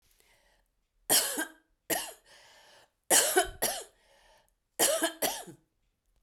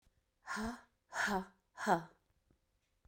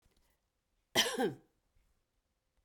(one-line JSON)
{"three_cough_length": "6.2 s", "three_cough_amplitude": 10992, "three_cough_signal_mean_std_ratio": 0.38, "exhalation_length": "3.1 s", "exhalation_amplitude": 4341, "exhalation_signal_mean_std_ratio": 0.39, "cough_length": "2.6 s", "cough_amplitude": 6892, "cough_signal_mean_std_ratio": 0.28, "survey_phase": "beta (2021-08-13 to 2022-03-07)", "age": "45-64", "gender": "Female", "wearing_mask": "No", "symptom_none": true, "symptom_onset": "7 days", "smoker_status": "Never smoked", "respiratory_condition_asthma": false, "respiratory_condition_other": false, "recruitment_source": "REACT", "submission_delay": "2 days", "covid_test_result": "Negative", "covid_test_method": "RT-qPCR"}